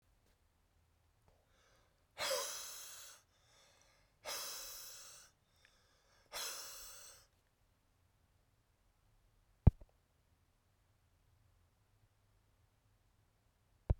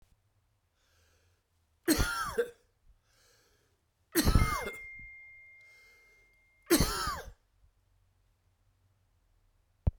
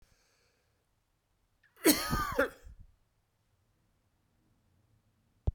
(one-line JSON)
{"exhalation_length": "14.0 s", "exhalation_amplitude": 9576, "exhalation_signal_mean_std_ratio": 0.19, "three_cough_length": "10.0 s", "three_cough_amplitude": 9681, "three_cough_signal_mean_std_ratio": 0.31, "cough_length": "5.5 s", "cough_amplitude": 10075, "cough_signal_mean_std_ratio": 0.25, "survey_phase": "beta (2021-08-13 to 2022-03-07)", "age": "65+", "gender": "Male", "wearing_mask": "No", "symptom_none": true, "smoker_status": "Ex-smoker", "respiratory_condition_asthma": true, "respiratory_condition_other": false, "recruitment_source": "REACT", "submission_delay": "1 day", "covid_test_result": "Negative", "covid_test_method": "RT-qPCR"}